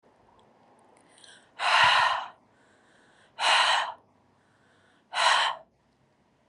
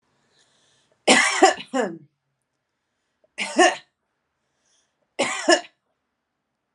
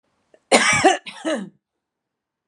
{
  "exhalation_length": "6.5 s",
  "exhalation_amplitude": 12590,
  "exhalation_signal_mean_std_ratio": 0.41,
  "three_cough_length": "6.7 s",
  "three_cough_amplitude": 29026,
  "three_cough_signal_mean_std_ratio": 0.31,
  "cough_length": "2.5 s",
  "cough_amplitude": 32767,
  "cough_signal_mean_std_ratio": 0.39,
  "survey_phase": "alpha (2021-03-01 to 2021-08-12)",
  "age": "45-64",
  "gender": "Female",
  "wearing_mask": "No",
  "symptom_none": true,
  "smoker_status": "Ex-smoker",
  "respiratory_condition_asthma": false,
  "respiratory_condition_other": false,
  "recruitment_source": "REACT",
  "submission_delay": "5 days",
  "covid_test_result": "Negative",
  "covid_test_method": "RT-qPCR"
}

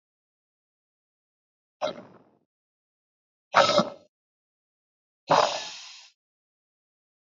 {
  "exhalation_length": "7.3 s",
  "exhalation_amplitude": 26707,
  "exhalation_signal_mean_std_ratio": 0.24,
  "survey_phase": "alpha (2021-03-01 to 2021-08-12)",
  "age": "18-44",
  "gender": "Female",
  "wearing_mask": "No",
  "symptom_cough_any": true,
  "symptom_fatigue": true,
  "symptom_headache": true,
  "symptom_change_to_sense_of_smell_or_taste": true,
  "symptom_loss_of_taste": true,
  "symptom_onset": "5 days",
  "smoker_status": "Never smoked",
  "respiratory_condition_asthma": true,
  "respiratory_condition_other": false,
  "recruitment_source": "Test and Trace",
  "submission_delay": "1 day",
  "covid_test_result": "Positive",
  "covid_test_method": "RT-qPCR",
  "covid_ct_value": 15.4,
  "covid_ct_gene": "ORF1ab gene",
  "covid_ct_mean": 15.8,
  "covid_viral_load": "6800000 copies/ml",
  "covid_viral_load_category": "High viral load (>1M copies/ml)"
}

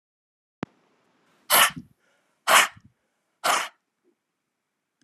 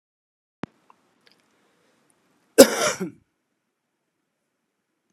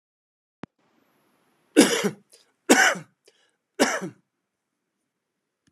{
  "exhalation_length": "5.0 s",
  "exhalation_amplitude": 27532,
  "exhalation_signal_mean_std_ratio": 0.27,
  "cough_length": "5.1 s",
  "cough_amplitude": 32768,
  "cough_signal_mean_std_ratio": 0.16,
  "three_cough_length": "5.7 s",
  "three_cough_amplitude": 32217,
  "three_cough_signal_mean_std_ratio": 0.27,
  "survey_phase": "beta (2021-08-13 to 2022-03-07)",
  "age": "45-64",
  "gender": "Male",
  "wearing_mask": "No",
  "symptom_cough_any": true,
  "symptom_runny_or_blocked_nose": true,
  "symptom_abdominal_pain": true,
  "symptom_fatigue": true,
  "symptom_fever_high_temperature": true,
  "symptom_headache": true,
  "symptom_onset": "2 days",
  "smoker_status": "Never smoked",
  "respiratory_condition_asthma": true,
  "respiratory_condition_other": true,
  "recruitment_source": "Test and Trace",
  "submission_delay": "2 days",
  "covid_test_result": "Positive",
  "covid_test_method": "RT-qPCR",
  "covid_ct_value": 15.7,
  "covid_ct_gene": "ORF1ab gene",
  "covid_ct_mean": 16.1,
  "covid_viral_load": "5200000 copies/ml",
  "covid_viral_load_category": "High viral load (>1M copies/ml)"
}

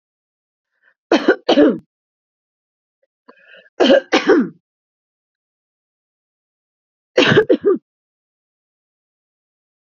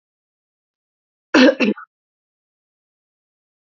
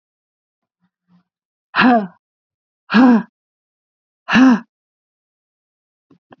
{
  "three_cough_length": "9.8 s",
  "three_cough_amplitude": 32767,
  "three_cough_signal_mean_std_ratio": 0.31,
  "cough_length": "3.7 s",
  "cough_amplitude": 28298,
  "cough_signal_mean_std_ratio": 0.23,
  "exhalation_length": "6.4 s",
  "exhalation_amplitude": 32767,
  "exhalation_signal_mean_std_ratio": 0.31,
  "survey_phase": "beta (2021-08-13 to 2022-03-07)",
  "age": "18-44",
  "gender": "Female",
  "wearing_mask": "No",
  "symptom_runny_or_blocked_nose": true,
  "symptom_onset": "5 days",
  "smoker_status": "Never smoked",
  "respiratory_condition_asthma": false,
  "respiratory_condition_other": false,
  "recruitment_source": "REACT",
  "submission_delay": "1 day",
  "covid_test_result": "Negative",
  "covid_test_method": "RT-qPCR"
}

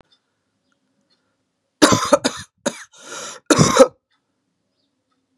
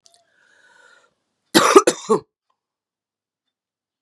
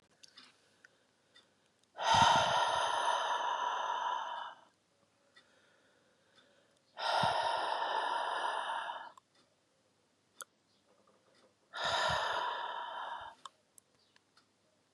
{
  "three_cough_length": "5.4 s",
  "three_cough_amplitude": 32768,
  "three_cough_signal_mean_std_ratio": 0.29,
  "cough_length": "4.0 s",
  "cough_amplitude": 32768,
  "cough_signal_mean_std_ratio": 0.24,
  "exhalation_length": "14.9 s",
  "exhalation_amplitude": 6710,
  "exhalation_signal_mean_std_ratio": 0.52,
  "survey_phase": "beta (2021-08-13 to 2022-03-07)",
  "age": "45-64",
  "gender": "Female",
  "wearing_mask": "No",
  "symptom_cough_any": true,
  "symptom_runny_or_blocked_nose": true,
  "symptom_sore_throat": true,
  "symptom_onset": "4 days",
  "smoker_status": "Never smoked",
  "respiratory_condition_asthma": false,
  "respiratory_condition_other": false,
  "recruitment_source": "Test and Trace",
  "submission_delay": "1 day",
  "covid_test_result": "Positive",
  "covid_test_method": "RT-qPCR",
  "covid_ct_value": 20.5,
  "covid_ct_gene": "N gene"
}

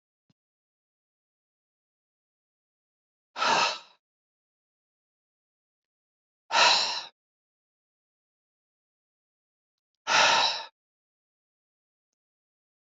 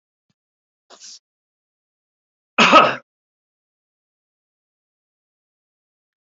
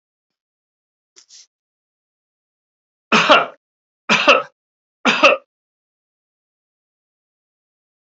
{
  "exhalation_length": "13.0 s",
  "exhalation_amplitude": 17352,
  "exhalation_signal_mean_std_ratio": 0.25,
  "cough_length": "6.2 s",
  "cough_amplitude": 30093,
  "cough_signal_mean_std_ratio": 0.18,
  "three_cough_length": "8.0 s",
  "three_cough_amplitude": 32768,
  "three_cough_signal_mean_std_ratio": 0.26,
  "survey_phase": "beta (2021-08-13 to 2022-03-07)",
  "age": "65+",
  "gender": "Male",
  "wearing_mask": "No",
  "symptom_none": true,
  "smoker_status": "Ex-smoker",
  "respiratory_condition_asthma": false,
  "respiratory_condition_other": false,
  "recruitment_source": "REACT",
  "submission_delay": "2 days",
  "covid_test_result": "Negative",
  "covid_test_method": "RT-qPCR",
  "influenza_a_test_result": "Negative",
  "influenza_b_test_result": "Negative"
}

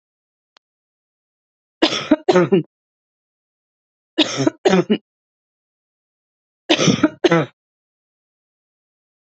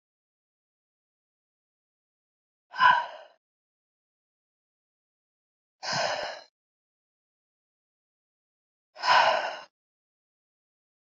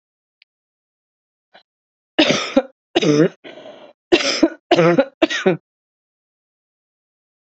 {
  "three_cough_length": "9.2 s",
  "three_cough_amplitude": 31548,
  "three_cough_signal_mean_std_ratio": 0.32,
  "exhalation_length": "11.1 s",
  "exhalation_amplitude": 14023,
  "exhalation_signal_mean_std_ratio": 0.24,
  "cough_length": "7.4 s",
  "cough_amplitude": 29678,
  "cough_signal_mean_std_ratio": 0.36,
  "survey_phase": "beta (2021-08-13 to 2022-03-07)",
  "age": "18-44",
  "gender": "Female",
  "wearing_mask": "No",
  "symptom_runny_or_blocked_nose": true,
  "symptom_sore_throat": true,
  "symptom_abdominal_pain": true,
  "symptom_fatigue": true,
  "symptom_headache": true,
  "smoker_status": "Ex-smoker",
  "respiratory_condition_asthma": false,
  "respiratory_condition_other": false,
  "recruitment_source": "Test and Trace",
  "submission_delay": "1 day",
  "covid_test_result": "Positive",
  "covid_test_method": "LFT"
}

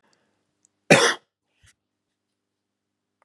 {
  "cough_length": "3.2 s",
  "cough_amplitude": 32767,
  "cough_signal_mean_std_ratio": 0.2,
  "survey_phase": "alpha (2021-03-01 to 2021-08-12)",
  "age": "45-64",
  "gender": "Male",
  "wearing_mask": "No",
  "symptom_none": true,
  "smoker_status": "Never smoked",
  "respiratory_condition_asthma": false,
  "respiratory_condition_other": false,
  "recruitment_source": "REACT",
  "submission_delay": "1 day",
  "covid_test_result": "Negative",
  "covid_test_method": "RT-qPCR"
}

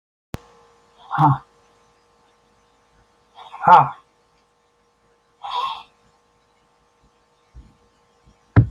{
  "exhalation_length": "8.7 s",
  "exhalation_amplitude": 28053,
  "exhalation_signal_mean_std_ratio": 0.23,
  "survey_phase": "beta (2021-08-13 to 2022-03-07)",
  "age": "65+",
  "gender": "Male",
  "wearing_mask": "No",
  "symptom_runny_or_blocked_nose": true,
  "smoker_status": "Never smoked",
  "respiratory_condition_asthma": true,
  "respiratory_condition_other": true,
  "recruitment_source": "REACT",
  "submission_delay": "1 day",
  "covid_test_result": "Negative",
  "covid_test_method": "RT-qPCR"
}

